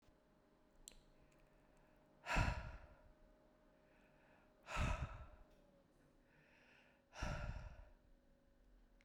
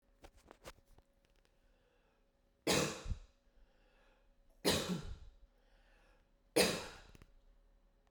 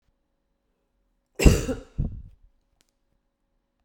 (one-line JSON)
{"exhalation_length": "9.0 s", "exhalation_amplitude": 1993, "exhalation_signal_mean_std_ratio": 0.37, "three_cough_length": "8.1 s", "three_cough_amplitude": 5450, "three_cough_signal_mean_std_ratio": 0.32, "cough_length": "3.8 s", "cough_amplitude": 32768, "cough_signal_mean_std_ratio": 0.22, "survey_phase": "beta (2021-08-13 to 2022-03-07)", "age": "18-44", "gender": "Female", "wearing_mask": "No", "symptom_cough_any": true, "symptom_new_continuous_cough": true, "symptom_runny_or_blocked_nose": true, "symptom_fatigue": true, "symptom_other": true, "symptom_onset": "4 days", "smoker_status": "Never smoked", "respiratory_condition_asthma": false, "respiratory_condition_other": false, "recruitment_source": "Test and Trace", "submission_delay": "2 days", "covid_test_result": "Positive", "covid_test_method": "RT-qPCR", "covid_ct_value": 19.1, "covid_ct_gene": "ORF1ab gene", "covid_ct_mean": 19.6, "covid_viral_load": "360000 copies/ml", "covid_viral_load_category": "Low viral load (10K-1M copies/ml)"}